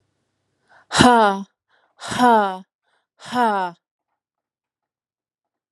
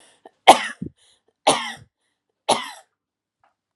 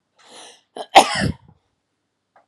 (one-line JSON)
{"exhalation_length": "5.7 s", "exhalation_amplitude": 32768, "exhalation_signal_mean_std_ratio": 0.36, "three_cough_length": "3.8 s", "three_cough_amplitude": 32768, "three_cough_signal_mean_std_ratio": 0.23, "cough_length": "2.5 s", "cough_amplitude": 32768, "cough_signal_mean_std_ratio": 0.24, "survey_phase": "alpha (2021-03-01 to 2021-08-12)", "age": "18-44", "gender": "Female", "wearing_mask": "No", "symptom_fatigue": true, "smoker_status": "Never smoked", "respiratory_condition_asthma": false, "respiratory_condition_other": false, "recruitment_source": "Test and Trace", "submission_delay": "-1 day", "covid_test_result": "Negative", "covid_test_method": "LFT"}